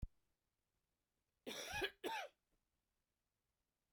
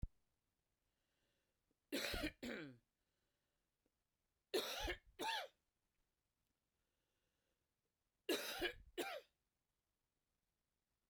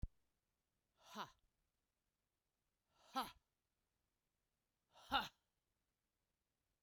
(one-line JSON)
{"cough_length": "3.9 s", "cough_amplitude": 1066, "cough_signal_mean_std_ratio": 0.34, "three_cough_length": "11.1 s", "three_cough_amplitude": 1306, "three_cough_signal_mean_std_ratio": 0.34, "exhalation_length": "6.8 s", "exhalation_amplitude": 2128, "exhalation_signal_mean_std_ratio": 0.2, "survey_phase": "beta (2021-08-13 to 2022-03-07)", "age": "45-64", "gender": "Female", "wearing_mask": "No", "symptom_cough_any": true, "symptom_runny_or_blocked_nose": true, "symptom_fever_high_temperature": true, "symptom_other": true, "smoker_status": "Never smoked", "respiratory_condition_asthma": false, "respiratory_condition_other": false, "recruitment_source": "Test and Trace", "submission_delay": "3 days", "covid_test_result": "Positive", "covid_test_method": "LFT"}